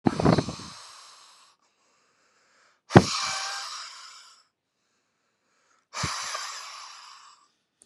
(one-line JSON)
{"exhalation_length": "7.9 s", "exhalation_amplitude": 32670, "exhalation_signal_mean_std_ratio": 0.28, "survey_phase": "beta (2021-08-13 to 2022-03-07)", "age": "18-44", "gender": "Male", "wearing_mask": "No", "symptom_none": true, "smoker_status": "Never smoked", "respiratory_condition_asthma": false, "respiratory_condition_other": false, "recruitment_source": "REACT", "submission_delay": "3 days", "covid_test_result": "Negative", "covid_test_method": "RT-qPCR", "influenza_a_test_result": "Negative", "influenza_b_test_result": "Negative"}